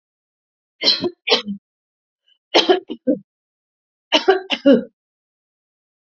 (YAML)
three_cough_length: 6.1 s
three_cough_amplitude: 31082
three_cough_signal_mean_std_ratio: 0.33
survey_phase: beta (2021-08-13 to 2022-03-07)
age: 18-44
gender: Female
wearing_mask: 'No'
symptom_cough_any: true
symptom_new_continuous_cough: true
symptom_runny_or_blocked_nose: true
symptom_sore_throat: true
symptom_abdominal_pain: true
symptom_fatigue: true
symptom_fever_high_temperature: true
symptom_other: true
smoker_status: Never smoked
respiratory_condition_asthma: false
respiratory_condition_other: false
recruitment_source: Test and Trace
submission_delay: 3 days
covid_test_result: Positive
covid_test_method: RT-qPCR
covid_ct_value: 20.7
covid_ct_gene: ORF1ab gene
covid_ct_mean: 21.2
covid_viral_load: 110000 copies/ml
covid_viral_load_category: Low viral load (10K-1M copies/ml)